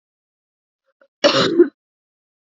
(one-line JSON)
{"cough_length": "2.6 s", "cough_amplitude": 29694, "cough_signal_mean_std_ratio": 0.3, "survey_phase": "alpha (2021-03-01 to 2021-08-12)", "age": "18-44", "gender": "Female", "wearing_mask": "No", "symptom_cough_any": true, "symptom_diarrhoea": true, "symptom_fatigue": true, "symptom_change_to_sense_of_smell_or_taste": true, "symptom_onset": "4 days", "smoker_status": "Never smoked", "respiratory_condition_asthma": false, "respiratory_condition_other": false, "recruitment_source": "Test and Trace", "submission_delay": "2 days", "covid_test_result": "Positive", "covid_test_method": "RT-qPCR", "covid_ct_value": 18.5, "covid_ct_gene": "ORF1ab gene"}